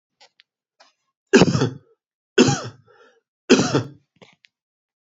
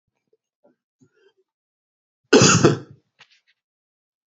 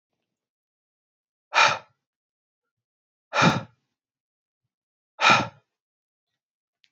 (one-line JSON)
{"three_cough_length": "5.0 s", "three_cough_amplitude": 30598, "three_cough_signal_mean_std_ratio": 0.31, "cough_length": "4.4 s", "cough_amplitude": 27605, "cough_signal_mean_std_ratio": 0.25, "exhalation_length": "6.9 s", "exhalation_amplitude": 22124, "exhalation_signal_mean_std_ratio": 0.25, "survey_phase": "beta (2021-08-13 to 2022-03-07)", "age": "45-64", "gender": "Male", "wearing_mask": "No", "symptom_runny_or_blocked_nose": true, "smoker_status": "Never smoked", "respiratory_condition_asthma": false, "respiratory_condition_other": false, "recruitment_source": "REACT", "submission_delay": "2 days", "covid_test_result": "Negative", "covid_test_method": "RT-qPCR"}